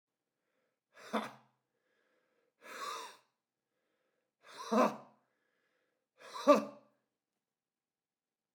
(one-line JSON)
{"exhalation_length": "8.5 s", "exhalation_amplitude": 9249, "exhalation_signal_mean_std_ratio": 0.22, "survey_phase": "beta (2021-08-13 to 2022-03-07)", "age": "18-44", "gender": "Male", "wearing_mask": "Yes", "symptom_cough_any": true, "symptom_runny_or_blocked_nose": true, "symptom_sore_throat": true, "symptom_fatigue": true, "symptom_fever_high_temperature": true, "symptom_headache": true, "symptom_onset": "4 days", "smoker_status": "Never smoked", "respiratory_condition_asthma": false, "respiratory_condition_other": false, "recruitment_source": "Test and Trace", "submission_delay": "1 day", "covid_test_result": "Positive", "covid_test_method": "RT-qPCR", "covid_ct_value": 22.6, "covid_ct_gene": "N gene"}